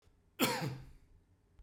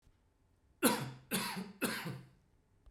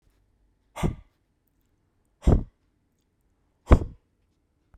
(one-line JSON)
{"cough_length": "1.6 s", "cough_amplitude": 4789, "cough_signal_mean_std_ratio": 0.42, "three_cough_length": "2.9 s", "three_cough_amplitude": 6247, "three_cough_signal_mean_std_ratio": 0.45, "exhalation_length": "4.8 s", "exhalation_amplitude": 32767, "exhalation_signal_mean_std_ratio": 0.2, "survey_phase": "beta (2021-08-13 to 2022-03-07)", "age": "45-64", "gender": "Male", "wearing_mask": "No", "symptom_none": true, "smoker_status": "Never smoked", "respiratory_condition_asthma": false, "respiratory_condition_other": false, "recruitment_source": "REACT", "submission_delay": "3 days", "covid_test_result": "Negative", "covid_test_method": "RT-qPCR", "influenza_a_test_result": "Unknown/Void", "influenza_b_test_result": "Unknown/Void"}